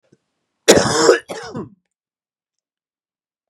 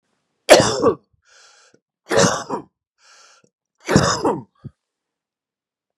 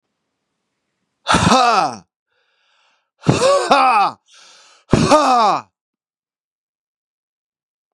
{"cough_length": "3.5 s", "cough_amplitude": 32768, "cough_signal_mean_std_ratio": 0.31, "three_cough_length": "6.0 s", "three_cough_amplitude": 32768, "three_cough_signal_mean_std_ratio": 0.33, "exhalation_length": "7.9 s", "exhalation_amplitude": 32768, "exhalation_signal_mean_std_ratio": 0.43, "survey_phase": "beta (2021-08-13 to 2022-03-07)", "age": "45-64", "gender": "Male", "wearing_mask": "No", "symptom_cough_any": true, "symptom_runny_or_blocked_nose": true, "symptom_sore_throat": true, "symptom_fatigue": true, "symptom_fever_high_temperature": true, "symptom_headache": true, "symptom_change_to_sense_of_smell_or_taste": true, "smoker_status": "Ex-smoker", "respiratory_condition_asthma": false, "respiratory_condition_other": false, "recruitment_source": "REACT", "submission_delay": "4 days", "covid_test_result": "Negative", "covid_test_method": "RT-qPCR", "influenza_a_test_result": "Negative", "influenza_b_test_result": "Negative"}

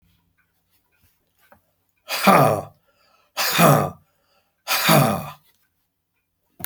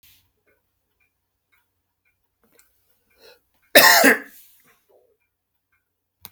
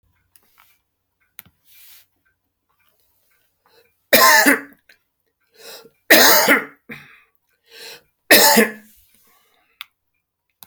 {"exhalation_length": "6.7 s", "exhalation_amplitude": 29734, "exhalation_signal_mean_std_ratio": 0.37, "cough_length": "6.3 s", "cough_amplitude": 32768, "cough_signal_mean_std_ratio": 0.21, "three_cough_length": "10.7 s", "three_cough_amplitude": 32768, "three_cough_signal_mean_std_ratio": 0.3, "survey_phase": "beta (2021-08-13 to 2022-03-07)", "age": "65+", "gender": "Male", "wearing_mask": "No", "symptom_none": true, "smoker_status": "Ex-smoker", "respiratory_condition_asthma": false, "respiratory_condition_other": false, "recruitment_source": "REACT", "submission_delay": "3 days", "covid_test_result": "Negative", "covid_test_method": "RT-qPCR"}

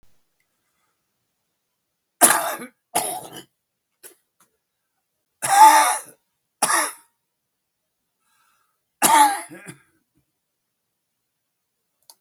{"three_cough_length": "12.2 s", "three_cough_amplitude": 32768, "three_cough_signal_mean_std_ratio": 0.27, "survey_phase": "beta (2021-08-13 to 2022-03-07)", "age": "65+", "gender": "Male", "wearing_mask": "No", "symptom_cough_any": true, "symptom_runny_or_blocked_nose": true, "symptom_shortness_of_breath": true, "symptom_fatigue": true, "symptom_headache": true, "symptom_other": true, "symptom_onset": "10 days", "smoker_status": "Current smoker (1 to 10 cigarettes per day)", "respiratory_condition_asthma": false, "respiratory_condition_other": true, "recruitment_source": "REACT", "submission_delay": "1 day", "covid_test_result": "Negative", "covid_test_method": "RT-qPCR"}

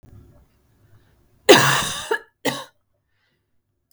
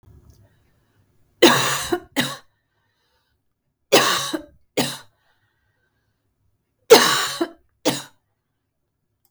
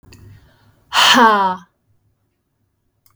{"cough_length": "3.9 s", "cough_amplitude": 32768, "cough_signal_mean_std_ratio": 0.28, "three_cough_length": "9.3 s", "three_cough_amplitude": 32768, "three_cough_signal_mean_std_ratio": 0.3, "exhalation_length": "3.2 s", "exhalation_amplitude": 32768, "exhalation_signal_mean_std_ratio": 0.38, "survey_phase": "beta (2021-08-13 to 2022-03-07)", "age": "45-64", "gender": "Female", "wearing_mask": "No", "symptom_cough_any": true, "symptom_runny_or_blocked_nose": true, "symptom_sore_throat": true, "smoker_status": "Never smoked", "respiratory_condition_asthma": false, "respiratory_condition_other": false, "recruitment_source": "REACT", "submission_delay": "2 days", "covid_test_result": "Negative", "covid_test_method": "RT-qPCR"}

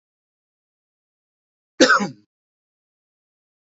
{"cough_length": "3.8 s", "cough_amplitude": 28535, "cough_signal_mean_std_ratio": 0.2, "survey_phase": "beta (2021-08-13 to 2022-03-07)", "age": "45-64", "gender": "Male", "wearing_mask": "No", "symptom_none": true, "smoker_status": "Ex-smoker", "respiratory_condition_asthma": false, "respiratory_condition_other": false, "recruitment_source": "REACT", "submission_delay": "2 days", "covid_test_result": "Negative", "covid_test_method": "RT-qPCR"}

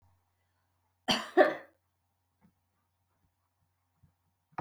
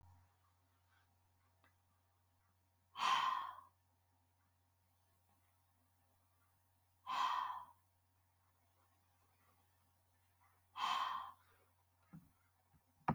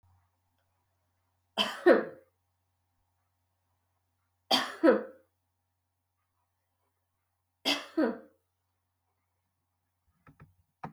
{"cough_length": "4.6 s", "cough_amplitude": 11649, "cough_signal_mean_std_ratio": 0.19, "exhalation_length": "13.1 s", "exhalation_amplitude": 2274, "exhalation_signal_mean_std_ratio": 0.31, "three_cough_length": "10.9 s", "three_cough_amplitude": 12851, "three_cough_signal_mean_std_ratio": 0.23, "survey_phase": "beta (2021-08-13 to 2022-03-07)", "age": "45-64", "gender": "Female", "wearing_mask": "No", "symptom_runny_or_blocked_nose": true, "symptom_other": true, "symptom_onset": "4 days", "smoker_status": "Never smoked", "respiratory_condition_asthma": false, "respiratory_condition_other": false, "recruitment_source": "Test and Trace", "submission_delay": "2 days", "covid_test_result": "Positive", "covid_test_method": "RT-qPCR", "covid_ct_value": 25.5, "covid_ct_gene": "ORF1ab gene", "covid_ct_mean": 26.0, "covid_viral_load": "3000 copies/ml", "covid_viral_load_category": "Minimal viral load (< 10K copies/ml)"}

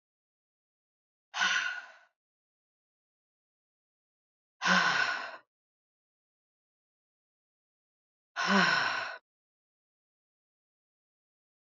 {"exhalation_length": "11.8 s", "exhalation_amplitude": 8740, "exhalation_signal_mean_std_ratio": 0.3, "survey_phase": "alpha (2021-03-01 to 2021-08-12)", "age": "45-64", "gender": "Female", "wearing_mask": "No", "symptom_cough_any": true, "symptom_new_continuous_cough": true, "symptom_shortness_of_breath": true, "symptom_fatigue": true, "symptom_fever_high_temperature": true, "symptom_headache": true, "symptom_change_to_sense_of_smell_or_taste": true, "symptom_onset": "3 days", "smoker_status": "Ex-smoker", "respiratory_condition_asthma": false, "respiratory_condition_other": false, "recruitment_source": "Test and Trace", "submission_delay": "1 day", "covid_test_result": "Positive", "covid_test_method": "RT-qPCR"}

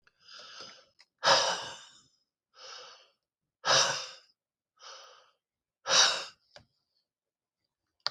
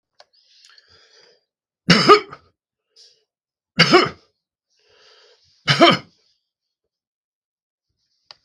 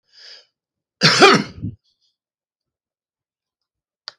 {"exhalation_length": "8.1 s", "exhalation_amplitude": 13256, "exhalation_signal_mean_std_ratio": 0.31, "three_cough_length": "8.4 s", "three_cough_amplitude": 32768, "three_cough_signal_mean_std_ratio": 0.25, "cough_length": "4.2 s", "cough_amplitude": 32768, "cough_signal_mean_std_ratio": 0.26, "survey_phase": "beta (2021-08-13 to 2022-03-07)", "age": "65+", "gender": "Male", "wearing_mask": "No", "symptom_none": true, "smoker_status": "Ex-smoker", "respiratory_condition_asthma": false, "respiratory_condition_other": false, "recruitment_source": "REACT", "submission_delay": "8 days", "covid_test_result": "Negative", "covid_test_method": "RT-qPCR", "influenza_a_test_result": "Negative", "influenza_b_test_result": "Negative"}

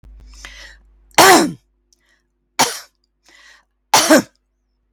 {"three_cough_length": "4.9 s", "three_cough_amplitude": 32767, "three_cough_signal_mean_std_ratio": 0.32, "survey_phase": "beta (2021-08-13 to 2022-03-07)", "age": "65+", "gender": "Female", "wearing_mask": "No", "symptom_none": true, "smoker_status": "Ex-smoker", "respiratory_condition_asthma": false, "respiratory_condition_other": false, "recruitment_source": "REACT", "submission_delay": "2 days", "covid_test_result": "Negative", "covid_test_method": "RT-qPCR", "influenza_a_test_result": "Positive", "influenza_a_ct_value": 31.8, "influenza_b_test_result": "Positive", "influenza_b_ct_value": 32.6}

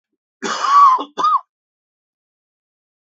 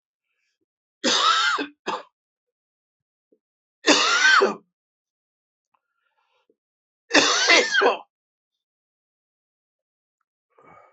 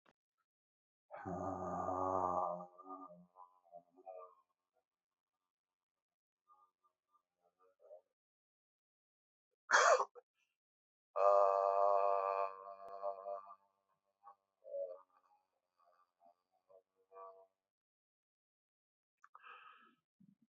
{"cough_length": "3.1 s", "cough_amplitude": 26172, "cough_signal_mean_std_ratio": 0.4, "three_cough_length": "10.9 s", "three_cough_amplitude": 27213, "three_cough_signal_mean_std_ratio": 0.36, "exhalation_length": "20.5 s", "exhalation_amplitude": 4692, "exhalation_signal_mean_std_ratio": 0.31, "survey_phase": "beta (2021-08-13 to 2022-03-07)", "age": "45-64", "gender": "Male", "wearing_mask": "No", "symptom_cough_any": true, "symptom_new_continuous_cough": true, "symptom_runny_or_blocked_nose": true, "symptom_shortness_of_breath": true, "symptom_abdominal_pain": true, "symptom_fatigue": true, "symptom_fever_high_temperature": true, "symptom_change_to_sense_of_smell_or_taste": true, "symptom_loss_of_taste": true, "symptom_other": true, "symptom_onset": "4 days", "smoker_status": "Never smoked", "respiratory_condition_asthma": false, "respiratory_condition_other": false, "recruitment_source": "Test and Trace", "submission_delay": "1 day", "covid_test_result": "Positive", "covid_test_method": "RT-qPCR", "covid_ct_value": 13.3, "covid_ct_gene": "ORF1ab gene", "covid_ct_mean": 13.8, "covid_viral_load": "30000000 copies/ml", "covid_viral_load_category": "High viral load (>1M copies/ml)"}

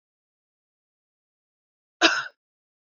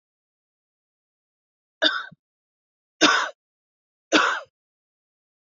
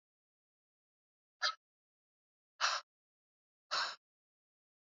{"cough_length": "2.9 s", "cough_amplitude": 20692, "cough_signal_mean_std_ratio": 0.19, "three_cough_length": "5.5 s", "three_cough_amplitude": 27829, "three_cough_signal_mean_std_ratio": 0.27, "exhalation_length": "4.9 s", "exhalation_amplitude": 3395, "exhalation_signal_mean_std_ratio": 0.25, "survey_phase": "beta (2021-08-13 to 2022-03-07)", "age": "45-64", "gender": "Female", "wearing_mask": "No", "symptom_cough_any": true, "symptom_runny_or_blocked_nose": true, "symptom_sore_throat": true, "symptom_abdominal_pain": true, "symptom_fatigue": true, "symptom_headache": true, "symptom_onset": "4 days", "smoker_status": "Never smoked", "respiratory_condition_asthma": false, "respiratory_condition_other": false, "recruitment_source": "Test and Trace", "submission_delay": "2 days", "covid_test_result": "Positive", "covid_test_method": "RT-qPCR", "covid_ct_value": 19.6, "covid_ct_gene": "N gene"}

